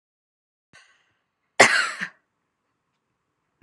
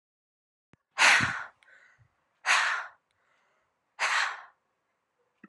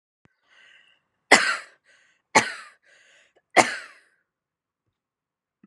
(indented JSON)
{
  "cough_length": "3.6 s",
  "cough_amplitude": 32712,
  "cough_signal_mean_std_ratio": 0.21,
  "exhalation_length": "5.5 s",
  "exhalation_amplitude": 17650,
  "exhalation_signal_mean_std_ratio": 0.35,
  "three_cough_length": "5.7 s",
  "three_cough_amplitude": 32767,
  "three_cough_signal_mean_std_ratio": 0.21,
  "survey_phase": "beta (2021-08-13 to 2022-03-07)",
  "age": "18-44",
  "gender": "Female",
  "wearing_mask": "No",
  "symptom_none": true,
  "smoker_status": "Never smoked",
  "respiratory_condition_asthma": true,
  "respiratory_condition_other": false,
  "recruitment_source": "REACT",
  "submission_delay": "3 days",
  "covid_test_result": "Negative",
  "covid_test_method": "RT-qPCR"
}